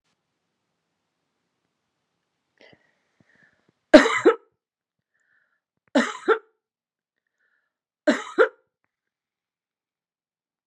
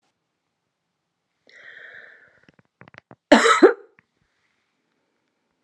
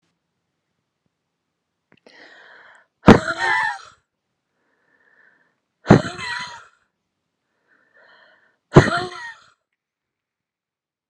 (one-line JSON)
{"three_cough_length": "10.7 s", "three_cough_amplitude": 32767, "three_cough_signal_mean_std_ratio": 0.19, "cough_length": "5.6 s", "cough_amplitude": 32767, "cough_signal_mean_std_ratio": 0.2, "exhalation_length": "11.1 s", "exhalation_amplitude": 32768, "exhalation_signal_mean_std_ratio": 0.21, "survey_phase": "alpha (2021-03-01 to 2021-08-12)", "age": "45-64", "gender": "Female", "wearing_mask": "No", "symptom_none": true, "smoker_status": "Ex-smoker", "respiratory_condition_asthma": false, "respiratory_condition_other": false, "recruitment_source": "REACT", "submission_delay": "3 days", "covid_test_result": "Negative", "covid_test_method": "RT-qPCR"}